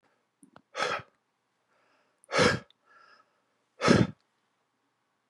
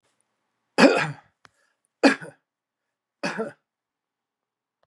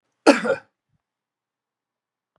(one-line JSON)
{"exhalation_length": "5.3 s", "exhalation_amplitude": 14323, "exhalation_signal_mean_std_ratio": 0.28, "three_cough_length": "4.9 s", "three_cough_amplitude": 30070, "three_cough_signal_mean_std_ratio": 0.24, "cough_length": "2.4 s", "cough_amplitude": 32442, "cough_signal_mean_std_ratio": 0.21, "survey_phase": "beta (2021-08-13 to 2022-03-07)", "age": "45-64", "gender": "Male", "wearing_mask": "No", "symptom_none": true, "smoker_status": "Ex-smoker", "respiratory_condition_asthma": false, "respiratory_condition_other": false, "recruitment_source": "REACT", "submission_delay": "2 days", "covid_test_result": "Negative", "covid_test_method": "RT-qPCR", "influenza_a_test_result": "Negative", "influenza_b_test_result": "Negative"}